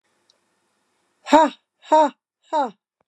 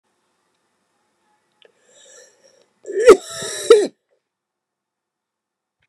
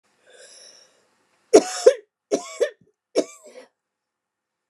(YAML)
exhalation_length: 3.1 s
exhalation_amplitude: 29203
exhalation_signal_mean_std_ratio: 0.31
cough_length: 5.9 s
cough_amplitude: 29204
cough_signal_mean_std_ratio: 0.21
three_cough_length: 4.7 s
three_cough_amplitude: 29204
three_cough_signal_mean_std_ratio: 0.23
survey_phase: beta (2021-08-13 to 2022-03-07)
age: 65+
gender: Female
wearing_mask: 'No'
symptom_shortness_of_breath: true
symptom_fatigue: true
smoker_status: Never smoked
respiratory_condition_asthma: true
respiratory_condition_other: false
recruitment_source: REACT
submission_delay: 2 days
covid_test_result: Negative
covid_test_method: RT-qPCR